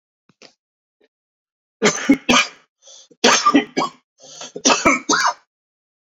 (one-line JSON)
{"three_cough_length": "6.1 s", "three_cough_amplitude": 32767, "three_cough_signal_mean_std_ratio": 0.4, "survey_phase": "beta (2021-08-13 to 2022-03-07)", "age": "45-64", "gender": "Male", "wearing_mask": "No", "symptom_none": true, "smoker_status": "Current smoker (1 to 10 cigarettes per day)", "respiratory_condition_asthma": false, "respiratory_condition_other": false, "recruitment_source": "REACT", "submission_delay": "2 days", "covid_test_result": "Negative", "covid_test_method": "RT-qPCR", "influenza_a_test_result": "Negative", "influenza_b_test_result": "Negative"}